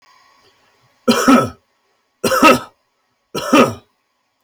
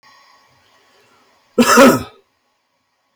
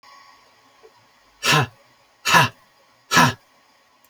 three_cough_length: 4.4 s
three_cough_amplitude: 31232
three_cough_signal_mean_std_ratio: 0.38
cough_length: 3.2 s
cough_amplitude: 32528
cough_signal_mean_std_ratio: 0.31
exhalation_length: 4.1 s
exhalation_amplitude: 30157
exhalation_signal_mean_std_ratio: 0.33
survey_phase: beta (2021-08-13 to 2022-03-07)
age: 45-64
gender: Male
wearing_mask: 'No'
symptom_none: true
smoker_status: Never smoked
respiratory_condition_asthma: false
respiratory_condition_other: false
recruitment_source: REACT
submission_delay: 13 days
covid_test_result: Negative
covid_test_method: RT-qPCR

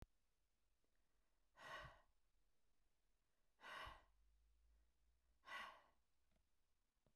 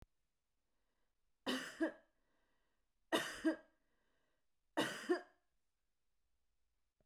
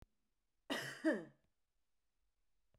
exhalation_length: 7.2 s
exhalation_amplitude: 233
exhalation_signal_mean_std_ratio: 0.43
three_cough_length: 7.1 s
three_cough_amplitude: 2883
three_cough_signal_mean_std_ratio: 0.3
cough_length: 2.8 s
cough_amplitude: 1816
cough_signal_mean_std_ratio: 0.3
survey_phase: beta (2021-08-13 to 2022-03-07)
age: 45-64
gender: Female
wearing_mask: 'No'
symptom_none: true
smoker_status: Ex-smoker
respiratory_condition_asthma: false
respiratory_condition_other: false
recruitment_source: REACT
submission_delay: 2 days
covid_test_result: Negative
covid_test_method: RT-qPCR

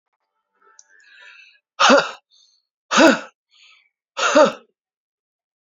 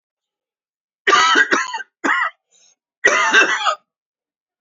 exhalation_length: 5.6 s
exhalation_amplitude: 28547
exhalation_signal_mean_std_ratio: 0.31
cough_length: 4.6 s
cough_amplitude: 29209
cough_signal_mean_std_ratio: 0.48
survey_phase: beta (2021-08-13 to 2022-03-07)
age: 45-64
gender: Male
wearing_mask: 'No'
symptom_cough_any: true
symptom_fatigue: true
symptom_fever_high_temperature: true
symptom_headache: true
symptom_onset: 3 days
smoker_status: Never smoked
respiratory_condition_asthma: false
respiratory_condition_other: false
recruitment_source: Test and Trace
submission_delay: 2 days
covid_test_result: Positive
covid_test_method: RT-qPCR
covid_ct_value: 15.2
covid_ct_gene: ORF1ab gene
covid_ct_mean: 15.7
covid_viral_load: 6900000 copies/ml
covid_viral_load_category: High viral load (>1M copies/ml)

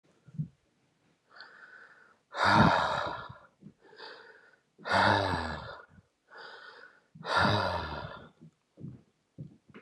exhalation_length: 9.8 s
exhalation_amplitude: 10344
exhalation_signal_mean_std_ratio: 0.42
survey_phase: beta (2021-08-13 to 2022-03-07)
age: 45-64
gender: Male
wearing_mask: 'No'
symptom_cough_any: true
symptom_runny_or_blocked_nose: true
symptom_fever_high_temperature: true
symptom_headache: true
symptom_change_to_sense_of_smell_or_taste: true
symptom_loss_of_taste: true
symptom_onset: 3 days
smoker_status: Never smoked
respiratory_condition_asthma: false
respiratory_condition_other: false
recruitment_source: Test and Trace
submission_delay: 1 day
covid_test_result: Positive
covid_test_method: RT-qPCR
covid_ct_value: 16.2
covid_ct_gene: ORF1ab gene
covid_ct_mean: 16.6
covid_viral_load: 3700000 copies/ml
covid_viral_load_category: High viral load (>1M copies/ml)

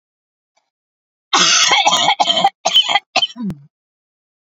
cough_length: 4.4 s
cough_amplitude: 32768
cough_signal_mean_std_ratio: 0.51
survey_phase: alpha (2021-03-01 to 2021-08-12)
age: 45-64
gender: Female
wearing_mask: 'No'
symptom_none: true
smoker_status: Never smoked
respiratory_condition_asthma: false
respiratory_condition_other: false
recruitment_source: REACT
submission_delay: 2 days
covid_test_result: Negative
covid_test_method: RT-qPCR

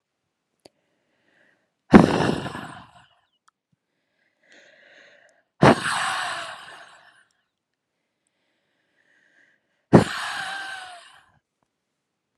exhalation_length: 12.4 s
exhalation_amplitude: 32768
exhalation_signal_mean_std_ratio: 0.24
survey_phase: beta (2021-08-13 to 2022-03-07)
age: 18-44
gender: Female
wearing_mask: 'Yes'
symptom_cough_any: true
symptom_runny_or_blocked_nose: true
symptom_shortness_of_breath: true
symptom_sore_throat: true
symptom_fatigue: true
symptom_change_to_sense_of_smell_or_taste: true
symptom_loss_of_taste: true
smoker_status: Never smoked
respiratory_condition_asthma: false
respiratory_condition_other: false
recruitment_source: Test and Trace
submission_delay: 3 days
covid_test_result: Positive
covid_test_method: RT-qPCR
covid_ct_value: 20.5
covid_ct_gene: ORF1ab gene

